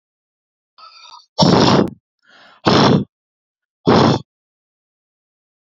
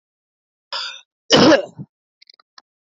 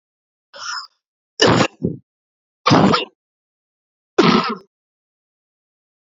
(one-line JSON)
{"exhalation_length": "5.6 s", "exhalation_amplitude": 28876, "exhalation_signal_mean_std_ratio": 0.39, "cough_length": "2.9 s", "cough_amplitude": 30864, "cough_signal_mean_std_ratio": 0.3, "three_cough_length": "6.1 s", "three_cough_amplitude": 32768, "three_cough_signal_mean_std_ratio": 0.34, "survey_phase": "beta (2021-08-13 to 2022-03-07)", "age": "45-64", "gender": "Male", "wearing_mask": "No", "symptom_cough_any": true, "symptom_sore_throat": true, "symptom_other": true, "symptom_onset": "3 days", "smoker_status": "Never smoked", "respiratory_condition_asthma": false, "respiratory_condition_other": false, "recruitment_source": "REACT", "submission_delay": "1 day", "covid_test_result": "Negative", "covid_test_method": "RT-qPCR", "influenza_a_test_result": "Negative", "influenza_b_test_result": "Negative"}